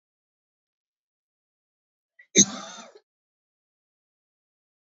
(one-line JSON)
{"cough_length": "4.9 s", "cough_amplitude": 25520, "cough_signal_mean_std_ratio": 0.13, "survey_phase": "alpha (2021-03-01 to 2021-08-12)", "age": "45-64", "gender": "Female", "wearing_mask": "No", "symptom_cough_any": true, "symptom_shortness_of_breath": true, "symptom_abdominal_pain": true, "symptom_diarrhoea": true, "symptom_fatigue": true, "symptom_headache": true, "symptom_change_to_sense_of_smell_or_taste": true, "smoker_status": "Ex-smoker", "respiratory_condition_asthma": false, "respiratory_condition_other": false, "recruitment_source": "Test and Trace", "submission_delay": "3 days", "covid_test_result": "Positive", "covid_test_method": "RT-qPCR", "covid_ct_value": 30.0, "covid_ct_gene": "ORF1ab gene", "covid_ct_mean": 31.0, "covid_viral_load": "70 copies/ml", "covid_viral_load_category": "Minimal viral load (< 10K copies/ml)"}